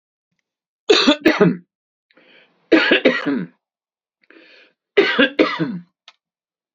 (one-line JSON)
{"three_cough_length": "6.7 s", "three_cough_amplitude": 30421, "three_cough_signal_mean_std_ratio": 0.4, "survey_phase": "beta (2021-08-13 to 2022-03-07)", "age": "45-64", "gender": "Male", "wearing_mask": "No", "symptom_none": true, "smoker_status": "Ex-smoker", "respiratory_condition_asthma": false, "respiratory_condition_other": false, "recruitment_source": "REACT", "submission_delay": "2 days", "covid_test_result": "Negative", "covid_test_method": "RT-qPCR", "influenza_a_test_result": "Negative", "influenza_b_test_result": "Negative"}